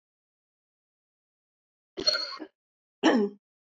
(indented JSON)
{
  "cough_length": "3.7 s",
  "cough_amplitude": 10615,
  "cough_signal_mean_std_ratio": 0.3,
  "survey_phase": "beta (2021-08-13 to 2022-03-07)",
  "age": "45-64",
  "gender": "Female",
  "wearing_mask": "No",
  "symptom_cough_any": true,
  "symptom_new_continuous_cough": true,
  "symptom_runny_or_blocked_nose": true,
  "symptom_sore_throat": true,
  "symptom_fatigue": true,
  "symptom_change_to_sense_of_smell_or_taste": true,
  "symptom_onset": "4 days",
  "smoker_status": "Never smoked",
  "respiratory_condition_asthma": false,
  "respiratory_condition_other": false,
  "recruitment_source": "Test and Trace",
  "submission_delay": "2 days",
  "covid_test_result": "Positive",
  "covid_test_method": "ePCR"
}